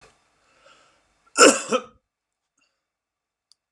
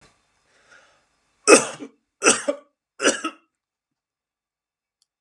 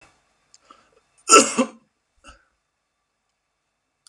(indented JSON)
{
  "exhalation_length": "3.7 s",
  "exhalation_amplitude": 32761,
  "exhalation_signal_mean_std_ratio": 0.21,
  "three_cough_length": "5.2 s",
  "three_cough_amplitude": 32768,
  "three_cough_signal_mean_std_ratio": 0.24,
  "cough_length": "4.1 s",
  "cough_amplitude": 32767,
  "cough_signal_mean_std_ratio": 0.2,
  "survey_phase": "beta (2021-08-13 to 2022-03-07)",
  "age": "45-64",
  "gender": "Male",
  "wearing_mask": "No",
  "symptom_sore_throat": true,
  "symptom_onset": "12 days",
  "smoker_status": "Ex-smoker",
  "respiratory_condition_asthma": false,
  "respiratory_condition_other": false,
  "recruitment_source": "REACT",
  "submission_delay": "2 days",
  "covid_test_result": "Negative",
  "covid_test_method": "RT-qPCR",
  "influenza_a_test_result": "Negative",
  "influenza_b_test_result": "Negative"
}